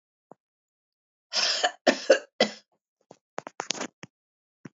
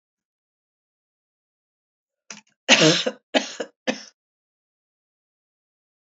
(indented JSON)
{
  "cough_length": "4.8 s",
  "cough_amplitude": 25115,
  "cough_signal_mean_std_ratio": 0.28,
  "three_cough_length": "6.1 s",
  "three_cough_amplitude": 30149,
  "three_cough_signal_mean_std_ratio": 0.23,
  "survey_phase": "alpha (2021-03-01 to 2021-08-12)",
  "age": "45-64",
  "gender": "Female",
  "wearing_mask": "No",
  "symptom_none": true,
  "smoker_status": "Ex-smoker",
  "respiratory_condition_asthma": false,
  "respiratory_condition_other": false,
  "recruitment_source": "REACT",
  "submission_delay": "1 day",
  "covid_test_result": "Negative",
  "covid_test_method": "RT-qPCR"
}